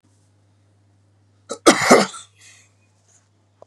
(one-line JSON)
{"cough_length": "3.7 s", "cough_amplitude": 32768, "cough_signal_mean_std_ratio": 0.25, "survey_phase": "beta (2021-08-13 to 2022-03-07)", "age": "45-64", "gender": "Male", "wearing_mask": "No", "symptom_runny_or_blocked_nose": true, "symptom_sore_throat": true, "symptom_onset": "3 days", "smoker_status": "Never smoked", "respiratory_condition_asthma": false, "respiratory_condition_other": false, "recruitment_source": "Test and Trace", "submission_delay": "1 day", "covid_test_result": "Positive", "covid_test_method": "ePCR"}